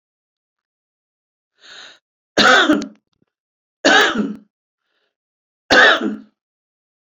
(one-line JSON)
{"three_cough_length": "7.1 s", "three_cough_amplitude": 31704, "three_cough_signal_mean_std_ratio": 0.34, "survey_phase": "beta (2021-08-13 to 2022-03-07)", "age": "65+", "gender": "Female", "wearing_mask": "No", "symptom_none": true, "smoker_status": "Ex-smoker", "respiratory_condition_asthma": false, "respiratory_condition_other": false, "recruitment_source": "REACT", "submission_delay": "4 days", "covid_test_result": "Negative", "covid_test_method": "RT-qPCR"}